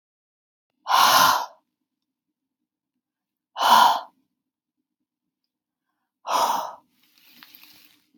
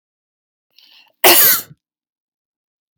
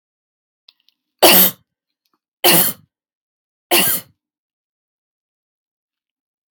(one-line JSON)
{"exhalation_length": "8.2 s", "exhalation_amplitude": 23076, "exhalation_signal_mean_std_ratio": 0.32, "cough_length": "3.0 s", "cough_amplitude": 32768, "cough_signal_mean_std_ratio": 0.29, "three_cough_length": "6.5 s", "three_cough_amplitude": 32768, "three_cough_signal_mean_std_ratio": 0.28, "survey_phase": "beta (2021-08-13 to 2022-03-07)", "age": "18-44", "gender": "Female", "wearing_mask": "No", "symptom_none": true, "smoker_status": "Never smoked", "respiratory_condition_asthma": false, "respiratory_condition_other": false, "recruitment_source": "REACT", "submission_delay": "1 day", "covid_test_result": "Negative", "covid_test_method": "RT-qPCR", "influenza_a_test_result": "Unknown/Void", "influenza_b_test_result": "Unknown/Void"}